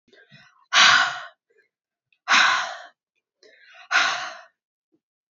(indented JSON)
{
  "exhalation_length": "5.3 s",
  "exhalation_amplitude": 25862,
  "exhalation_signal_mean_std_ratio": 0.37,
  "survey_phase": "beta (2021-08-13 to 2022-03-07)",
  "age": "18-44",
  "gender": "Female",
  "wearing_mask": "No",
  "symptom_runny_or_blocked_nose": true,
  "symptom_headache": true,
  "symptom_other": true,
  "smoker_status": "Never smoked",
  "respiratory_condition_asthma": true,
  "respiratory_condition_other": false,
  "recruitment_source": "Test and Trace",
  "submission_delay": "1 day",
  "covid_test_result": "Positive",
  "covid_test_method": "RT-qPCR",
  "covid_ct_value": 28.3,
  "covid_ct_gene": "ORF1ab gene",
  "covid_ct_mean": 28.9,
  "covid_viral_load": "340 copies/ml",
  "covid_viral_load_category": "Minimal viral load (< 10K copies/ml)"
}